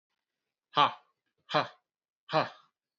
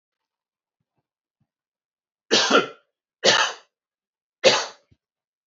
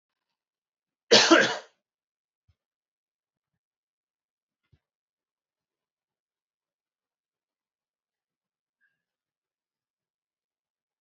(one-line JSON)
{"exhalation_length": "3.0 s", "exhalation_amplitude": 13536, "exhalation_signal_mean_std_ratio": 0.27, "three_cough_length": "5.5 s", "three_cough_amplitude": 26679, "three_cough_signal_mean_std_ratio": 0.29, "cough_length": "11.0 s", "cough_amplitude": 23016, "cough_signal_mean_std_ratio": 0.14, "survey_phase": "alpha (2021-03-01 to 2021-08-12)", "age": "45-64", "gender": "Male", "wearing_mask": "No", "symptom_cough_any": true, "smoker_status": "Never smoked", "respiratory_condition_asthma": false, "respiratory_condition_other": false, "recruitment_source": "Test and Trace", "submission_delay": "2 days", "covid_test_result": "Positive", "covid_test_method": "RT-qPCR"}